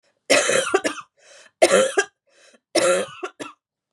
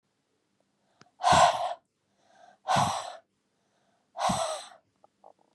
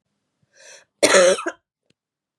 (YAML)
three_cough_length: 3.9 s
three_cough_amplitude: 29533
three_cough_signal_mean_std_ratio: 0.47
exhalation_length: 5.5 s
exhalation_amplitude: 12444
exhalation_signal_mean_std_ratio: 0.36
cough_length: 2.4 s
cough_amplitude: 29519
cough_signal_mean_std_ratio: 0.33
survey_phase: beta (2021-08-13 to 2022-03-07)
age: 18-44
gender: Female
wearing_mask: 'No'
symptom_cough_any: true
symptom_sore_throat: true
symptom_fatigue: true
symptom_headache: true
smoker_status: Never smoked
respiratory_condition_asthma: false
respiratory_condition_other: false
recruitment_source: Test and Trace
submission_delay: 1 day
covid_test_result: Positive
covid_test_method: RT-qPCR
covid_ct_value: 33.5
covid_ct_gene: N gene